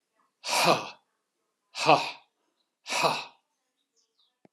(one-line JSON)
{"exhalation_length": "4.5 s", "exhalation_amplitude": 20691, "exhalation_signal_mean_std_ratio": 0.34, "survey_phase": "alpha (2021-03-01 to 2021-08-12)", "age": "65+", "gender": "Male", "wearing_mask": "No", "symptom_none": true, "smoker_status": "Never smoked", "respiratory_condition_asthma": false, "respiratory_condition_other": false, "recruitment_source": "REACT", "submission_delay": "2 days", "covid_test_result": "Negative", "covid_test_method": "RT-qPCR"}